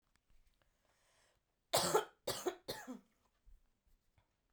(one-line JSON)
{"three_cough_length": "4.5 s", "three_cough_amplitude": 3695, "three_cough_signal_mean_std_ratio": 0.29, "survey_phase": "alpha (2021-03-01 to 2021-08-12)", "age": "18-44", "gender": "Female", "wearing_mask": "No", "symptom_cough_any": true, "symptom_shortness_of_breath": true, "symptom_fatigue": true, "symptom_headache": true, "symptom_loss_of_taste": true, "symptom_onset": "3 days", "smoker_status": "Ex-smoker", "respiratory_condition_asthma": false, "respiratory_condition_other": false, "recruitment_source": "Test and Trace", "submission_delay": "2 days", "covid_test_result": "Positive", "covid_test_method": "RT-qPCR", "covid_ct_value": 16.7, "covid_ct_gene": "ORF1ab gene", "covid_ct_mean": 17.3, "covid_viral_load": "2100000 copies/ml", "covid_viral_load_category": "High viral load (>1M copies/ml)"}